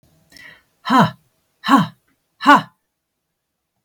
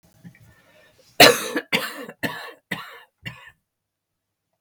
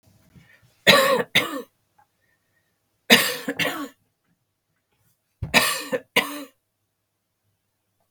{"exhalation_length": "3.8 s", "exhalation_amplitude": 32766, "exhalation_signal_mean_std_ratio": 0.31, "cough_length": "4.6 s", "cough_amplitude": 32768, "cough_signal_mean_std_ratio": 0.25, "three_cough_length": "8.1 s", "three_cough_amplitude": 32768, "three_cough_signal_mean_std_ratio": 0.32, "survey_phase": "beta (2021-08-13 to 2022-03-07)", "age": "65+", "gender": "Female", "wearing_mask": "No", "symptom_cough_any": true, "symptom_runny_or_blocked_nose": true, "symptom_onset": "12 days", "smoker_status": "Never smoked", "respiratory_condition_asthma": false, "respiratory_condition_other": false, "recruitment_source": "REACT", "submission_delay": "3 days", "covid_test_result": "Negative", "covid_test_method": "RT-qPCR", "influenza_a_test_result": "Negative", "influenza_b_test_result": "Negative"}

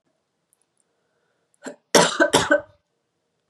{"cough_length": "3.5 s", "cough_amplitude": 31767, "cough_signal_mean_std_ratio": 0.3, "survey_phase": "beta (2021-08-13 to 2022-03-07)", "age": "18-44", "gender": "Female", "wearing_mask": "No", "symptom_runny_or_blocked_nose": true, "smoker_status": "Never smoked", "respiratory_condition_asthma": false, "respiratory_condition_other": false, "recruitment_source": "REACT", "submission_delay": "2 days", "covid_test_result": "Negative", "covid_test_method": "RT-qPCR", "influenza_a_test_result": "Negative", "influenza_b_test_result": "Negative"}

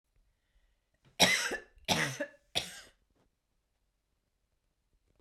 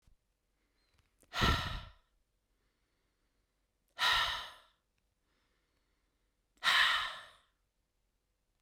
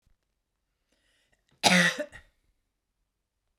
{"three_cough_length": "5.2 s", "three_cough_amplitude": 11438, "three_cough_signal_mean_std_ratio": 0.29, "exhalation_length": "8.6 s", "exhalation_amplitude": 5425, "exhalation_signal_mean_std_ratio": 0.32, "cough_length": "3.6 s", "cough_amplitude": 22385, "cough_signal_mean_std_ratio": 0.25, "survey_phase": "beta (2021-08-13 to 2022-03-07)", "age": "45-64", "gender": "Female", "wearing_mask": "No", "symptom_none": true, "smoker_status": "Never smoked", "respiratory_condition_asthma": false, "respiratory_condition_other": false, "recruitment_source": "REACT", "submission_delay": "1 day", "covid_test_result": "Negative", "covid_test_method": "RT-qPCR"}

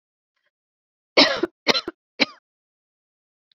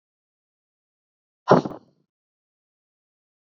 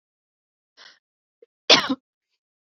{"three_cough_length": "3.6 s", "three_cough_amplitude": 29449, "three_cough_signal_mean_std_ratio": 0.24, "exhalation_length": "3.6 s", "exhalation_amplitude": 27372, "exhalation_signal_mean_std_ratio": 0.15, "cough_length": "2.7 s", "cough_amplitude": 32768, "cough_signal_mean_std_ratio": 0.19, "survey_phase": "beta (2021-08-13 to 2022-03-07)", "age": "18-44", "gender": "Female", "wearing_mask": "No", "symptom_fatigue": true, "smoker_status": "Never smoked", "respiratory_condition_asthma": true, "respiratory_condition_other": false, "recruitment_source": "REACT", "submission_delay": "1 day", "covid_test_result": "Negative", "covid_test_method": "RT-qPCR"}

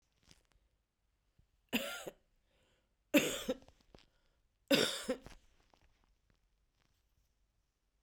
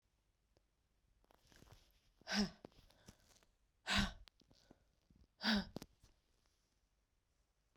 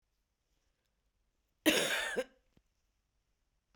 {"three_cough_length": "8.0 s", "three_cough_amplitude": 7679, "three_cough_signal_mean_std_ratio": 0.25, "exhalation_length": "7.8 s", "exhalation_amplitude": 2606, "exhalation_signal_mean_std_ratio": 0.27, "cough_length": "3.8 s", "cough_amplitude": 7457, "cough_signal_mean_std_ratio": 0.29, "survey_phase": "beta (2021-08-13 to 2022-03-07)", "age": "18-44", "gender": "Female", "wearing_mask": "No", "symptom_runny_or_blocked_nose": true, "symptom_onset": "3 days", "smoker_status": "Current smoker (1 to 10 cigarettes per day)", "respiratory_condition_asthma": false, "respiratory_condition_other": false, "recruitment_source": "Test and Trace", "submission_delay": "2 days", "covid_test_result": "Positive", "covid_test_method": "RT-qPCR"}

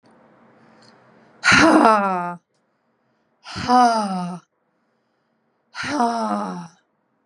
{"exhalation_length": "7.3 s", "exhalation_amplitude": 32767, "exhalation_signal_mean_std_ratio": 0.42, "survey_phase": "beta (2021-08-13 to 2022-03-07)", "age": "45-64", "gender": "Female", "wearing_mask": "No", "symptom_none": true, "symptom_onset": "12 days", "smoker_status": "Never smoked", "respiratory_condition_asthma": true, "respiratory_condition_other": false, "recruitment_source": "REACT", "submission_delay": "6 days", "covid_test_result": "Negative", "covid_test_method": "RT-qPCR", "influenza_a_test_result": "Negative", "influenza_b_test_result": "Negative"}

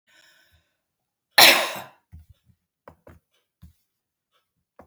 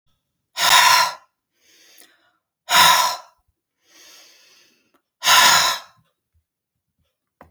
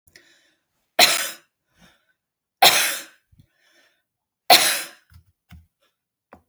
{"cough_length": "4.9 s", "cough_amplitude": 32767, "cough_signal_mean_std_ratio": 0.19, "exhalation_length": "7.5 s", "exhalation_amplitude": 32767, "exhalation_signal_mean_std_ratio": 0.37, "three_cough_length": "6.5 s", "three_cough_amplitude": 32768, "three_cough_signal_mean_std_ratio": 0.27, "survey_phase": "beta (2021-08-13 to 2022-03-07)", "age": "65+", "gender": "Female", "wearing_mask": "No", "symptom_none": true, "smoker_status": "Never smoked", "respiratory_condition_asthma": false, "respiratory_condition_other": false, "recruitment_source": "Test and Trace", "submission_delay": "2 days", "covid_test_result": "Negative", "covid_test_method": "LFT"}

